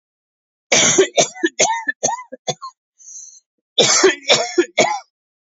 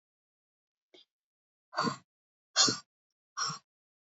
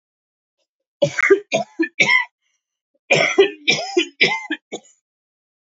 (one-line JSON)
{"cough_length": "5.5 s", "cough_amplitude": 31305, "cough_signal_mean_std_ratio": 0.48, "exhalation_length": "4.2 s", "exhalation_amplitude": 10776, "exhalation_signal_mean_std_ratio": 0.26, "three_cough_length": "5.7 s", "three_cough_amplitude": 30339, "three_cough_signal_mean_std_ratio": 0.42, "survey_phase": "beta (2021-08-13 to 2022-03-07)", "age": "45-64", "gender": "Male", "wearing_mask": "No", "symptom_new_continuous_cough": true, "symptom_runny_or_blocked_nose": true, "symptom_shortness_of_breath": true, "symptom_fatigue": true, "symptom_fever_high_temperature": true, "symptom_headache": true, "symptom_change_to_sense_of_smell_or_taste": true, "smoker_status": "Never smoked", "respiratory_condition_asthma": false, "respiratory_condition_other": false, "recruitment_source": "Test and Trace", "submission_delay": "2 days", "covid_test_result": "Negative", "covid_test_method": "RT-qPCR"}